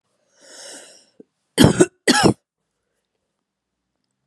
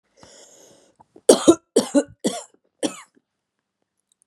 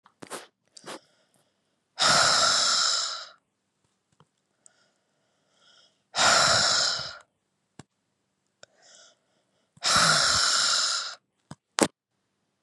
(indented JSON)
{
  "cough_length": "4.3 s",
  "cough_amplitude": 32768,
  "cough_signal_mean_std_ratio": 0.26,
  "three_cough_length": "4.3 s",
  "three_cough_amplitude": 32767,
  "three_cough_signal_mean_std_ratio": 0.25,
  "exhalation_length": "12.6 s",
  "exhalation_amplitude": 30423,
  "exhalation_signal_mean_std_ratio": 0.44,
  "survey_phase": "beta (2021-08-13 to 2022-03-07)",
  "age": "45-64",
  "gender": "Female",
  "wearing_mask": "No",
  "symptom_cough_any": true,
  "symptom_runny_or_blocked_nose": true,
  "symptom_sore_throat": true,
  "symptom_fatigue": true,
  "symptom_fever_high_temperature": true,
  "symptom_headache": true,
  "symptom_change_to_sense_of_smell_or_taste": true,
  "symptom_loss_of_taste": true,
  "symptom_onset": "3 days",
  "smoker_status": "Never smoked",
  "respiratory_condition_asthma": false,
  "respiratory_condition_other": false,
  "recruitment_source": "Test and Trace",
  "submission_delay": "2 days",
  "covid_test_result": "Positive",
  "covid_test_method": "RT-qPCR",
  "covid_ct_value": 27.7,
  "covid_ct_gene": "ORF1ab gene"
}